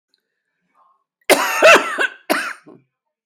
{"cough_length": "3.3 s", "cough_amplitude": 32768, "cough_signal_mean_std_ratio": 0.38, "survey_phase": "beta (2021-08-13 to 2022-03-07)", "age": "65+", "gender": "Female", "wearing_mask": "No", "symptom_cough_any": true, "symptom_runny_or_blocked_nose": true, "symptom_shortness_of_breath": true, "symptom_onset": "13 days", "smoker_status": "Ex-smoker", "respiratory_condition_asthma": true, "respiratory_condition_other": false, "recruitment_source": "REACT", "submission_delay": "2 days", "covid_test_result": "Negative", "covid_test_method": "RT-qPCR", "influenza_a_test_result": "Negative", "influenza_b_test_result": "Negative"}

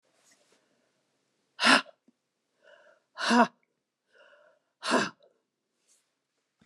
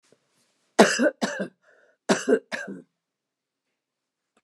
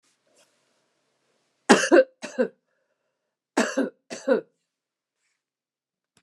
{"exhalation_length": "6.7 s", "exhalation_amplitude": 17321, "exhalation_signal_mean_std_ratio": 0.24, "cough_length": "4.4 s", "cough_amplitude": 29199, "cough_signal_mean_std_ratio": 0.3, "three_cough_length": "6.2 s", "three_cough_amplitude": 29203, "three_cough_signal_mean_std_ratio": 0.26, "survey_phase": "beta (2021-08-13 to 2022-03-07)", "age": "65+", "gender": "Female", "wearing_mask": "No", "symptom_none": true, "smoker_status": "Never smoked", "respiratory_condition_asthma": false, "respiratory_condition_other": false, "recruitment_source": "REACT", "submission_delay": "1 day", "covid_test_result": "Negative", "covid_test_method": "RT-qPCR"}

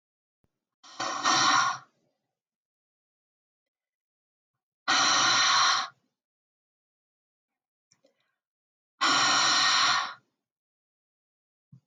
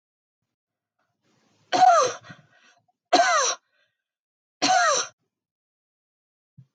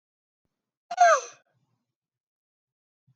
{"exhalation_length": "11.9 s", "exhalation_amplitude": 9506, "exhalation_signal_mean_std_ratio": 0.41, "three_cough_length": "6.7 s", "three_cough_amplitude": 17256, "three_cough_signal_mean_std_ratio": 0.35, "cough_length": "3.2 s", "cough_amplitude": 12413, "cough_signal_mean_std_ratio": 0.22, "survey_phase": "beta (2021-08-13 to 2022-03-07)", "age": "65+", "gender": "Female", "wearing_mask": "No", "symptom_none": true, "smoker_status": "Ex-smoker", "respiratory_condition_asthma": false, "respiratory_condition_other": false, "recruitment_source": "REACT", "submission_delay": "1 day", "covid_test_result": "Negative", "covid_test_method": "RT-qPCR"}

